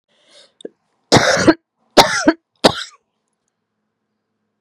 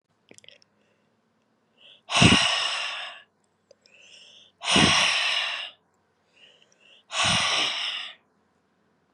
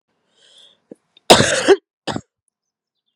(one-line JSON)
{"three_cough_length": "4.6 s", "three_cough_amplitude": 32768, "three_cough_signal_mean_std_ratio": 0.31, "exhalation_length": "9.1 s", "exhalation_amplitude": 22141, "exhalation_signal_mean_std_ratio": 0.43, "cough_length": "3.2 s", "cough_amplitude": 32768, "cough_signal_mean_std_ratio": 0.28, "survey_phase": "beta (2021-08-13 to 2022-03-07)", "age": "45-64", "gender": "Female", "wearing_mask": "No", "symptom_cough_any": true, "symptom_runny_or_blocked_nose": true, "symptom_shortness_of_breath": true, "symptom_onset": "5 days", "smoker_status": "Never smoked", "respiratory_condition_asthma": false, "respiratory_condition_other": false, "recruitment_source": "Test and Trace", "submission_delay": "1 day", "covid_test_result": "Positive", "covid_test_method": "ePCR"}